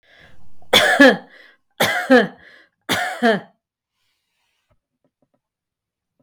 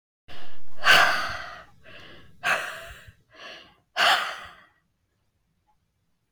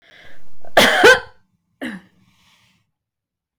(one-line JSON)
{"three_cough_length": "6.2 s", "three_cough_amplitude": 32768, "three_cough_signal_mean_std_ratio": 0.36, "exhalation_length": "6.3 s", "exhalation_amplitude": 20964, "exhalation_signal_mean_std_ratio": 0.48, "cough_length": "3.6 s", "cough_amplitude": 32768, "cough_signal_mean_std_ratio": 0.4, "survey_phase": "beta (2021-08-13 to 2022-03-07)", "age": "45-64", "gender": "Female", "wearing_mask": "No", "symptom_none": true, "smoker_status": "Ex-smoker", "respiratory_condition_asthma": true, "respiratory_condition_other": false, "recruitment_source": "REACT", "submission_delay": "1 day", "covid_test_result": "Negative", "covid_test_method": "RT-qPCR"}